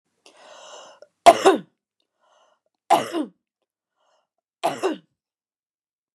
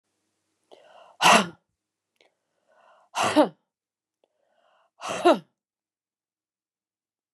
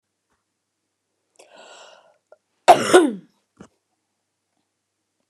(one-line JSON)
{"three_cough_length": "6.1 s", "three_cough_amplitude": 29204, "three_cough_signal_mean_std_ratio": 0.23, "exhalation_length": "7.3 s", "exhalation_amplitude": 24148, "exhalation_signal_mean_std_ratio": 0.24, "cough_length": "5.3 s", "cough_amplitude": 29204, "cough_signal_mean_std_ratio": 0.2, "survey_phase": "beta (2021-08-13 to 2022-03-07)", "age": "65+", "gender": "Female", "wearing_mask": "No", "symptom_none": true, "smoker_status": "Never smoked", "respiratory_condition_asthma": false, "respiratory_condition_other": false, "recruitment_source": "REACT", "submission_delay": "2 days", "covid_test_result": "Negative", "covid_test_method": "RT-qPCR", "influenza_a_test_result": "Negative", "influenza_b_test_result": "Negative"}